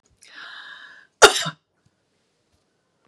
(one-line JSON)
{"cough_length": "3.1 s", "cough_amplitude": 32768, "cough_signal_mean_std_ratio": 0.19, "survey_phase": "beta (2021-08-13 to 2022-03-07)", "age": "45-64", "gender": "Female", "wearing_mask": "No", "symptom_none": true, "smoker_status": "Ex-smoker", "respiratory_condition_asthma": true, "respiratory_condition_other": false, "recruitment_source": "REACT", "submission_delay": "1 day", "covid_test_result": "Negative", "covid_test_method": "RT-qPCR", "influenza_a_test_result": "Negative", "influenza_b_test_result": "Negative"}